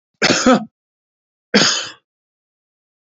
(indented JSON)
{
  "cough_length": "3.2 s",
  "cough_amplitude": 32324,
  "cough_signal_mean_std_ratio": 0.36,
  "survey_phase": "beta (2021-08-13 to 2022-03-07)",
  "age": "45-64",
  "gender": "Male",
  "wearing_mask": "No",
  "symptom_cough_any": true,
  "symptom_runny_or_blocked_nose": true,
  "symptom_shortness_of_breath": true,
  "symptom_fatigue": true,
  "smoker_status": "Ex-smoker",
  "respiratory_condition_asthma": false,
  "respiratory_condition_other": true,
  "recruitment_source": "Test and Trace",
  "submission_delay": "1 day",
  "covid_test_result": "Negative",
  "covid_test_method": "ePCR"
}